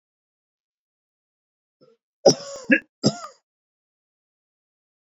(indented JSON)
{
  "cough_length": "5.1 s",
  "cough_amplitude": 28669,
  "cough_signal_mean_std_ratio": 0.18,
  "survey_phase": "beta (2021-08-13 to 2022-03-07)",
  "age": "45-64",
  "gender": "Male",
  "wearing_mask": "No",
  "symptom_none": true,
  "smoker_status": "Ex-smoker",
  "respiratory_condition_asthma": false,
  "respiratory_condition_other": false,
  "recruitment_source": "REACT",
  "submission_delay": "2 days",
  "covid_test_result": "Negative",
  "covid_test_method": "RT-qPCR"
}